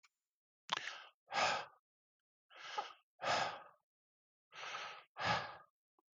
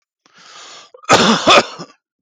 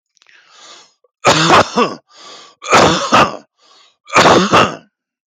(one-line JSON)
{"exhalation_length": "6.1 s", "exhalation_amplitude": 4333, "exhalation_signal_mean_std_ratio": 0.41, "cough_length": "2.2 s", "cough_amplitude": 32768, "cough_signal_mean_std_ratio": 0.42, "three_cough_length": "5.3 s", "three_cough_amplitude": 32768, "three_cough_signal_mean_std_ratio": 0.49, "survey_phase": "beta (2021-08-13 to 2022-03-07)", "age": "45-64", "gender": "Male", "wearing_mask": "No", "symptom_abdominal_pain": true, "symptom_other": true, "symptom_onset": "6 days", "smoker_status": "Ex-smoker", "respiratory_condition_asthma": false, "respiratory_condition_other": false, "recruitment_source": "REACT", "submission_delay": "1 day", "covid_test_result": "Negative", "covid_test_method": "RT-qPCR", "influenza_a_test_result": "Negative", "influenza_b_test_result": "Negative"}